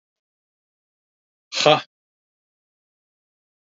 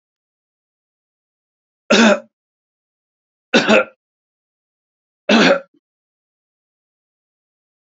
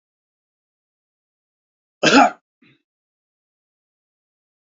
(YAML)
exhalation_length: 3.7 s
exhalation_amplitude: 27808
exhalation_signal_mean_std_ratio: 0.17
three_cough_length: 7.9 s
three_cough_amplitude: 29929
three_cough_signal_mean_std_ratio: 0.27
cough_length: 4.8 s
cough_amplitude: 29545
cough_signal_mean_std_ratio: 0.18
survey_phase: beta (2021-08-13 to 2022-03-07)
age: 65+
gender: Male
wearing_mask: 'No'
symptom_none: true
smoker_status: Never smoked
respiratory_condition_asthma: false
respiratory_condition_other: false
recruitment_source: REACT
submission_delay: 5 days
covid_test_result: Negative
covid_test_method: RT-qPCR
influenza_a_test_result: Negative
influenza_b_test_result: Negative